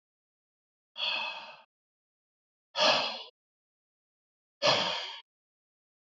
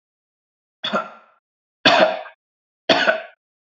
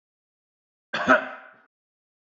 exhalation_length: 6.1 s
exhalation_amplitude: 9261
exhalation_signal_mean_std_ratio: 0.34
three_cough_length: 3.7 s
three_cough_amplitude: 30931
three_cough_signal_mean_std_ratio: 0.36
cough_length: 2.3 s
cough_amplitude: 18994
cough_signal_mean_std_ratio: 0.26
survey_phase: beta (2021-08-13 to 2022-03-07)
age: 45-64
gender: Male
wearing_mask: 'No'
symptom_none: true
smoker_status: Never smoked
respiratory_condition_asthma: false
respiratory_condition_other: false
recruitment_source: REACT
submission_delay: 1 day
covid_test_result: Negative
covid_test_method: RT-qPCR
influenza_a_test_result: Negative
influenza_b_test_result: Negative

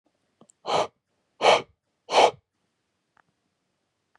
exhalation_length: 4.2 s
exhalation_amplitude: 21859
exhalation_signal_mean_std_ratio: 0.28
survey_phase: beta (2021-08-13 to 2022-03-07)
age: 45-64
gender: Male
wearing_mask: 'No'
symptom_cough_any: true
symptom_new_continuous_cough: true
symptom_runny_or_blocked_nose: true
symptom_fatigue: true
symptom_fever_high_temperature: true
symptom_headache: true
symptom_change_to_sense_of_smell_or_taste: true
symptom_loss_of_taste: true
symptom_onset: 3 days
smoker_status: Never smoked
respiratory_condition_asthma: false
respiratory_condition_other: false
recruitment_source: Test and Trace
submission_delay: 2 days
covid_test_result: Positive
covid_test_method: RT-qPCR
covid_ct_value: 26.0
covid_ct_gene: ORF1ab gene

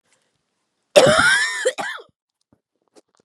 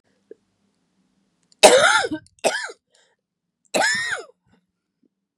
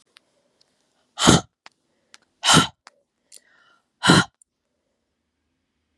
cough_length: 3.2 s
cough_amplitude: 32768
cough_signal_mean_std_ratio: 0.39
three_cough_length: 5.4 s
three_cough_amplitude: 32768
three_cough_signal_mean_std_ratio: 0.32
exhalation_length: 6.0 s
exhalation_amplitude: 32767
exhalation_signal_mean_std_ratio: 0.25
survey_phase: beta (2021-08-13 to 2022-03-07)
age: 45-64
gender: Female
wearing_mask: 'No'
symptom_cough_any: true
symptom_new_continuous_cough: true
symptom_runny_or_blocked_nose: true
symptom_sore_throat: true
symptom_fever_high_temperature: true
symptom_headache: true
symptom_change_to_sense_of_smell_or_taste: true
symptom_onset: 3 days
smoker_status: Never smoked
respiratory_condition_asthma: false
respiratory_condition_other: false
recruitment_source: Test and Trace
submission_delay: 2 days
covid_test_result: Positive
covid_test_method: RT-qPCR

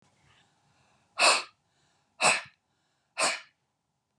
exhalation_length: 4.2 s
exhalation_amplitude: 13104
exhalation_signal_mean_std_ratio: 0.3
survey_phase: beta (2021-08-13 to 2022-03-07)
age: 45-64
gender: Female
wearing_mask: 'No'
symptom_none: true
smoker_status: Never smoked
respiratory_condition_asthma: false
respiratory_condition_other: false
recruitment_source: REACT
submission_delay: 2 days
covid_test_result: Negative
covid_test_method: RT-qPCR
influenza_a_test_result: Negative
influenza_b_test_result: Negative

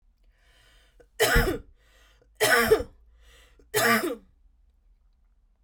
three_cough_length: 5.6 s
three_cough_amplitude: 13925
three_cough_signal_mean_std_ratio: 0.38
survey_phase: beta (2021-08-13 to 2022-03-07)
age: 18-44
gender: Female
wearing_mask: 'No'
symptom_diarrhoea: true
symptom_fatigue: true
symptom_headache: true
symptom_change_to_sense_of_smell_or_taste: true
smoker_status: Ex-smoker
respiratory_condition_asthma: false
respiratory_condition_other: false
recruitment_source: REACT
submission_delay: 2 days
covid_test_result: Negative
covid_test_method: RT-qPCR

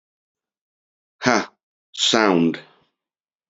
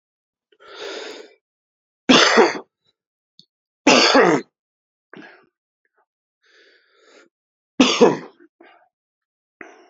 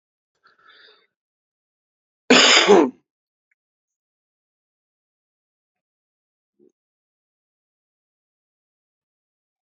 exhalation_length: 3.5 s
exhalation_amplitude: 28903
exhalation_signal_mean_std_ratio: 0.35
three_cough_length: 9.9 s
three_cough_amplitude: 30337
three_cough_signal_mean_std_ratio: 0.3
cough_length: 9.6 s
cough_amplitude: 31812
cough_signal_mean_std_ratio: 0.19
survey_phase: alpha (2021-03-01 to 2021-08-12)
age: 45-64
gender: Male
wearing_mask: 'No'
symptom_shortness_of_breath: true
symptom_headache: true
smoker_status: Never smoked
respiratory_condition_asthma: true
respiratory_condition_other: false
recruitment_source: Test and Trace
submission_delay: 2 days
covid_test_result: Positive
covid_test_method: RT-qPCR
covid_ct_value: 12.1
covid_ct_gene: ORF1ab gene
covid_ct_mean: 13.1
covid_viral_load: 52000000 copies/ml
covid_viral_load_category: High viral load (>1M copies/ml)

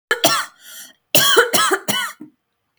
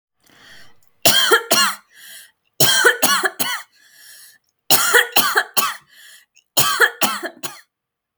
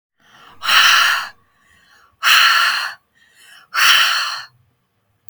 cough_length: 2.8 s
cough_amplitude: 32768
cough_signal_mean_std_ratio: 0.52
three_cough_length: 8.2 s
three_cough_amplitude: 32768
three_cough_signal_mean_std_ratio: 0.48
exhalation_length: 5.3 s
exhalation_amplitude: 32768
exhalation_signal_mean_std_ratio: 0.51
survey_phase: beta (2021-08-13 to 2022-03-07)
age: 18-44
gender: Female
wearing_mask: 'No'
symptom_runny_or_blocked_nose: true
symptom_onset: 13 days
smoker_status: Never smoked
respiratory_condition_asthma: false
respiratory_condition_other: false
recruitment_source: REACT
submission_delay: 1 day
covid_test_result: Negative
covid_test_method: RT-qPCR
influenza_a_test_result: Negative
influenza_b_test_result: Negative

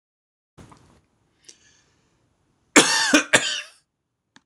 cough_length: 4.5 s
cough_amplitude: 26028
cough_signal_mean_std_ratio: 0.28
survey_phase: alpha (2021-03-01 to 2021-08-12)
age: 45-64
gender: Male
wearing_mask: 'No'
symptom_none: true
smoker_status: Never smoked
respiratory_condition_asthma: false
respiratory_condition_other: false
recruitment_source: REACT
submission_delay: 1 day
covid_test_result: Negative
covid_test_method: RT-qPCR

